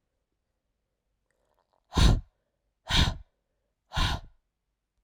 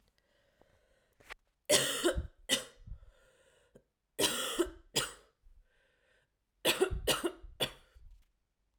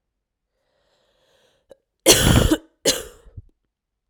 {"exhalation_length": "5.0 s", "exhalation_amplitude": 13101, "exhalation_signal_mean_std_ratio": 0.29, "three_cough_length": "8.8 s", "three_cough_amplitude": 9793, "three_cough_signal_mean_std_ratio": 0.38, "cough_length": "4.1 s", "cough_amplitude": 32768, "cough_signal_mean_std_ratio": 0.31, "survey_phase": "alpha (2021-03-01 to 2021-08-12)", "age": "18-44", "gender": "Female", "wearing_mask": "No", "symptom_cough_any": true, "symptom_new_continuous_cough": true, "symptom_abdominal_pain": true, "symptom_diarrhoea": true, "symptom_fatigue": true, "symptom_headache": true, "symptom_onset": "4 days", "smoker_status": "Never smoked", "respiratory_condition_asthma": false, "respiratory_condition_other": false, "recruitment_source": "Test and Trace", "submission_delay": "2 days", "covid_test_result": "Positive", "covid_test_method": "RT-qPCR", "covid_ct_value": 12.3, "covid_ct_gene": "ORF1ab gene", "covid_ct_mean": 12.8, "covid_viral_load": "61000000 copies/ml", "covid_viral_load_category": "High viral load (>1M copies/ml)"}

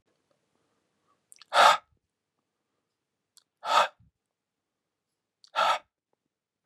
{"exhalation_length": "6.7 s", "exhalation_amplitude": 17923, "exhalation_signal_mean_std_ratio": 0.24, "survey_phase": "beta (2021-08-13 to 2022-03-07)", "age": "45-64", "gender": "Male", "wearing_mask": "No", "symptom_none": true, "smoker_status": "Ex-smoker", "respiratory_condition_asthma": false, "respiratory_condition_other": false, "recruitment_source": "REACT", "submission_delay": "1 day", "covid_test_result": "Negative", "covid_test_method": "RT-qPCR", "influenza_a_test_result": "Negative", "influenza_b_test_result": "Negative"}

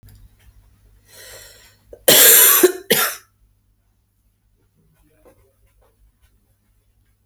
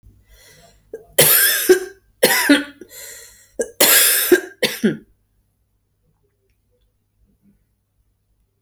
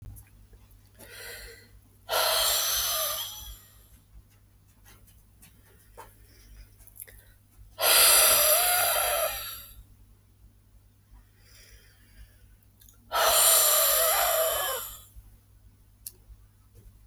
{"cough_length": "7.3 s", "cough_amplitude": 32768, "cough_signal_mean_std_ratio": 0.28, "three_cough_length": "8.6 s", "three_cough_amplitude": 32768, "three_cough_signal_mean_std_ratio": 0.38, "exhalation_length": "17.1 s", "exhalation_amplitude": 15912, "exhalation_signal_mean_std_ratio": 0.46, "survey_phase": "beta (2021-08-13 to 2022-03-07)", "age": "45-64", "gender": "Female", "wearing_mask": "No", "symptom_runny_or_blocked_nose": true, "symptom_shortness_of_breath": true, "symptom_abdominal_pain": true, "symptom_fatigue": true, "symptom_change_to_sense_of_smell_or_taste": true, "symptom_other": true, "smoker_status": "Ex-smoker", "respiratory_condition_asthma": false, "respiratory_condition_other": false, "recruitment_source": "Test and Trace", "submission_delay": "1 day", "covid_test_result": "Positive", "covid_test_method": "RT-qPCR"}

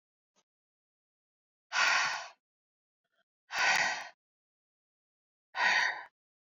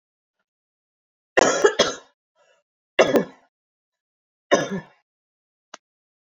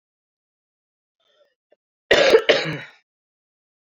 {"exhalation_length": "6.6 s", "exhalation_amplitude": 5915, "exhalation_signal_mean_std_ratio": 0.37, "three_cough_length": "6.3 s", "three_cough_amplitude": 26197, "three_cough_signal_mean_std_ratio": 0.28, "cough_length": "3.8 s", "cough_amplitude": 30921, "cough_signal_mean_std_ratio": 0.29, "survey_phase": "beta (2021-08-13 to 2022-03-07)", "age": "45-64", "gender": "Female", "wearing_mask": "No", "symptom_cough_any": true, "symptom_new_continuous_cough": true, "symptom_runny_or_blocked_nose": true, "symptom_headache": true, "symptom_change_to_sense_of_smell_or_taste": true, "symptom_onset": "4 days", "smoker_status": "Never smoked", "respiratory_condition_asthma": false, "respiratory_condition_other": false, "recruitment_source": "Test and Trace", "submission_delay": "2 days", "covid_test_result": "Positive", "covid_test_method": "RT-qPCR", "covid_ct_value": 19.1, "covid_ct_gene": "ORF1ab gene"}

